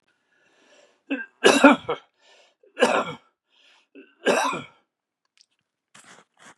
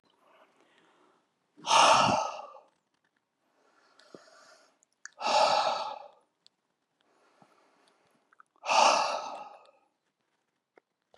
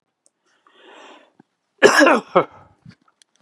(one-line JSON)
{"three_cough_length": "6.6 s", "three_cough_amplitude": 32695, "three_cough_signal_mean_std_ratio": 0.29, "exhalation_length": "11.2 s", "exhalation_amplitude": 12553, "exhalation_signal_mean_std_ratio": 0.33, "cough_length": "3.4 s", "cough_amplitude": 32768, "cough_signal_mean_std_ratio": 0.29, "survey_phase": "beta (2021-08-13 to 2022-03-07)", "age": "65+", "gender": "Male", "wearing_mask": "No", "symptom_cough_any": true, "symptom_fatigue": true, "smoker_status": "Ex-smoker", "respiratory_condition_asthma": false, "respiratory_condition_other": false, "recruitment_source": "REACT", "submission_delay": "10 days", "covid_test_result": "Negative", "covid_test_method": "RT-qPCR", "influenza_a_test_result": "Negative", "influenza_b_test_result": "Negative"}